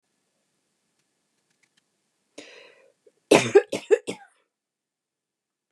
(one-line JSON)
{"cough_length": "5.7 s", "cough_amplitude": 29089, "cough_signal_mean_std_ratio": 0.19, "survey_phase": "beta (2021-08-13 to 2022-03-07)", "age": "45-64", "gender": "Female", "wearing_mask": "No", "symptom_none": true, "smoker_status": "Never smoked", "respiratory_condition_asthma": false, "respiratory_condition_other": false, "recruitment_source": "REACT", "submission_delay": "1 day", "covid_test_result": "Negative", "covid_test_method": "RT-qPCR", "influenza_a_test_result": "Negative", "influenza_b_test_result": "Negative"}